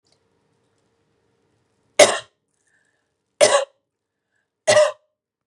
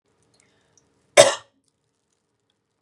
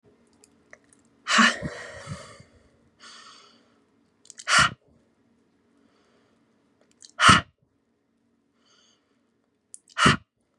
{
  "three_cough_length": "5.5 s",
  "three_cough_amplitude": 32767,
  "three_cough_signal_mean_std_ratio": 0.25,
  "cough_length": "2.8 s",
  "cough_amplitude": 32768,
  "cough_signal_mean_std_ratio": 0.17,
  "exhalation_length": "10.6 s",
  "exhalation_amplitude": 31690,
  "exhalation_signal_mean_std_ratio": 0.25,
  "survey_phase": "beta (2021-08-13 to 2022-03-07)",
  "age": "18-44",
  "gender": "Female",
  "wearing_mask": "No",
  "symptom_none": true,
  "smoker_status": "Ex-smoker",
  "respiratory_condition_asthma": false,
  "respiratory_condition_other": false,
  "recruitment_source": "REACT",
  "submission_delay": "3 days",
  "covid_test_result": "Negative",
  "covid_test_method": "RT-qPCR",
  "influenza_a_test_result": "Negative",
  "influenza_b_test_result": "Negative"
}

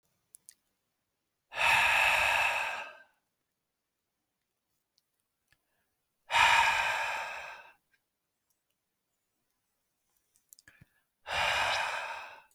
{
  "exhalation_length": "12.5 s",
  "exhalation_amplitude": 9410,
  "exhalation_signal_mean_std_ratio": 0.4,
  "survey_phase": "alpha (2021-03-01 to 2021-08-12)",
  "age": "18-44",
  "gender": "Male",
  "wearing_mask": "No",
  "symptom_none": true,
  "smoker_status": "Never smoked",
  "respiratory_condition_asthma": false,
  "respiratory_condition_other": false,
  "recruitment_source": "REACT",
  "submission_delay": "1 day",
  "covid_test_result": "Negative",
  "covid_test_method": "RT-qPCR"
}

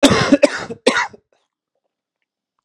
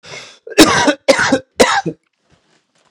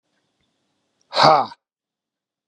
{
  "cough_length": "2.6 s",
  "cough_amplitude": 32768,
  "cough_signal_mean_std_ratio": 0.37,
  "three_cough_length": "2.9 s",
  "three_cough_amplitude": 32768,
  "three_cough_signal_mean_std_ratio": 0.45,
  "exhalation_length": "2.5 s",
  "exhalation_amplitude": 32768,
  "exhalation_signal_mean_std_ratio": 0.26,
  "survey_phase": "beta (2021-08-13 to 2022-03-07)",
  "age": "45-64",
  "gender": "Male",
  "wearing_mask": "No",
  "symptom_cough_any": true,
  "symptom_runny_or_blocked_nose": true,
  "symptom_shortness_of_breath": true,
  "symptom_fatigue": true,
  "symptom_fever_high_temperature": true,
  "symptom_headache": true,
  "symptom_onset": "3 days",
  "smoker_status": "Never smoked",
  "respiratory_condition_asthma": false,
  "respiratory_condition_other": false,
  "recruitment_source": "Test and Trace",
  "submission_delay": "2 days",
  "covid_test_result": "Positive",
  "covid_test_method": "RT-qPCR",
  "covid_ct_value": 21.2,
  "covid_ct_gene": "S gene",
  "covid_ct_mean": 21.6,
  "covid_viral_load": "80000 copies/ml",
  "covid_viral_load_category": "Low viral load (10K-1M copies/ml)"
}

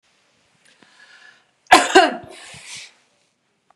{
  "three_cough_length": "3.8 s",
  "three_cough_amplitude": 32768,
  "three_cough_signal_mean_std_ratio": 0.25,
  "survey_phase": "beta (2021-08-13 to 2022-03-07)",
  "age": "45-64",
  "gender": "Female",
  "wearing_mask": "No",
  "symptom_none": true,
  "smoker_status": "Never smoked",
  "respiratory_condition_asthma": false,
  "respiratory_condition_other": false,
  "recruitment_source": "REACT",
  "submission_delay": "1 day",
  "covid_test_result": "Negative",
  "covid_test_method": "RT-qPCR",
  "influenza_a_test_result": "Unknown/Void",
  "influenza_b_test_result": "Unknown/Void"
}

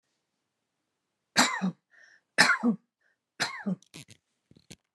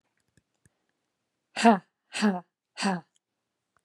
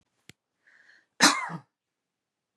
{
  "three_cough_length": "4.9 s",
  "three_cough_amplitude": 20546,
  "three_cough_signal_mean_std_ratio": 0.32,
  "exhalation_length": "3.8 s",
  "exhalation_amplitude": 21591,
  "exhalation_signal_mean_std_ratio": 0.27,
  "cough_length": "2.6 s",
  "cough_amplitude": 21584,
  "cough_signal_mean_std_ratio": 0.23,
  "survey_phase": "beta (2021-08-13 to 2022-03-07)",
  "age": "45-64",
  "gender": "Female",
  "wearing_mask": "No",
  "symptom_none": true,
  "smoker_status": "Never smoked",
  "respiratory_condition_asthma": true,
  "respiratory_condition_other": false,
  "recruitment_source": "REACT",
  "submission_delay": "1 day",
  "covid_test_result": "Negative",
  "covid_test_method": "RT-qPCR"
}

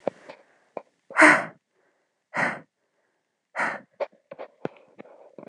{
  "exhalation_length": "5.5 s",
  "exhalation_amplitude": 25017,
  "exhalation_signal_mean_std_ratio": 0.26,
  "survey_phase": "beta (2021-08-13 to 2022-03-07)",
  "age": "45-64",
  "gender": "Female",
  "wearing_mask": "No",
  "symptom_cough_any": true,
  "symptom_runny_or_blocked_nose": true,
  "symptom_shortness_of_breath": true,
  "symptom_fatigue": true,
  "symptom_change_to_sense_of_smell_or_taste": true,
  "symptom_onset": "12 days",
  "smoker_status": "Ex-smoker",
  "respiratory_condition_asthma": false,
  "respiratory_condition_other": false,
  "recruitment_source": "REACT",
  "submission_delay": "0 days",
  "covid_test_result": "Negative",
  "covid_test_method": "RT-qPCR"
}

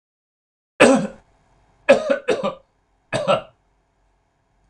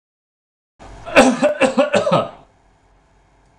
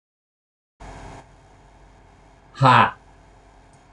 {
  "three_cough_length": "4.7 s",
  "three_cough_amplitude": 26028,
  "three_cough_signal_mean_std_ratio": 0.33,
  "cough_length": "3.6 s",
  "cough_amplitude": 26028,
  "cough_signal_mean_std_ratio": 0.42,
  "exhalation_length": "3.9 s",
  "exhalation_amplitude": 24309,
  "exhalation_signal_mean_std_ratio": 0.26,
  "survey_phase": "alpha (2021-03-01 to 2021-08-12)",
  "age": "65+",
  "gender": "Male",
  "wearing_mask": "No",
  "symptom_none": true,
  "smoker_status": "Never smoked",
  "respiratory_condition_asthma": false,
  "respiratory_condition_other": false,
  "recruitment_source": "REACT",
  "submission_delay": "1 day",
  "covid_test_result": "Negative",
  "covid_test_method": "RT-qPCR"
}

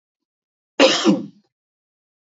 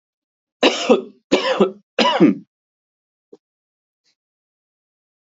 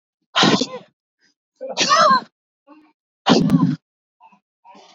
{
  "cough_length": "2.2 s",
  "cough_amplitude": 27588,
  "cough_signal_mean_std_ratio": 0.33,
  "three_cough_length": "5.4 s",
  "three_cough_amplitude": 27192,
  "three_cough_signal_mean_std_ratio": 0.34,
  "exhalation_length": "4.9 s",
  "exhalation_amplitude": 26416,
  "exhalation_signal_mean_std_ratio": 0.42,
  "survey_phase": "beta (2021-08-13 to 2022-03-07)",
  "age": "18-44",
  "gender": "Male",
  "wearing_mask": "No",
  "symptom_none": true,
  "smoker_status": "Never smoked",
  "respiratory_condition_asthma": false,
  "respiratory_condition_other": false,
  "recruitment_source": "REACT",
  "submission_delay": "33 days",
  "covid_test_result": "Negative",
  "covid_test_method": "RT-qPCR",
  "influenza_a_test_result": "Negative",
  "influenza_b_test_result": "Negative"
}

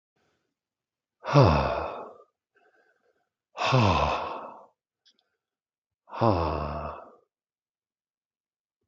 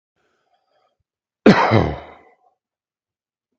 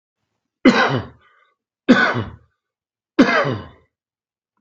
{
  "exhalation_length": "8.9 s",
  "exhalation_amplitude": 19253,
  "exhalation_signal_mean_std_ratio": 0.36,
  "cough_length": "3.6 s",
  "cough_amplitude": 32768,
  "cough_signal_mean_std_ratio": 0.26,
  "three_cough_length": "4.6 s",
  "three_cough_amplitude": 32766,
  "three_cough_signal_mean_std_ratio": 0.37,
  "survey_phase": "beta (2021-08-13 to 2022-03-07)",
  "age": "45-64",
  "gender": "Male",
  "wearing_mask": "No",
  "symptom_none": true,
  "smoker_status": "Current smoker (e-cigarettes or vapes only)",
  "respiratory_condition_asthma": false,
  "respiratory_condition_other": false,
  "recruitment_source": "REACT",
  "submission_delay": "1 day",
  "covid_test_result": "Negative",
  "covid_test_method": "RT-qPCR",
  "influenza_a_test_result": "Negative",
  "influenza_b_test_result": "Negative"
}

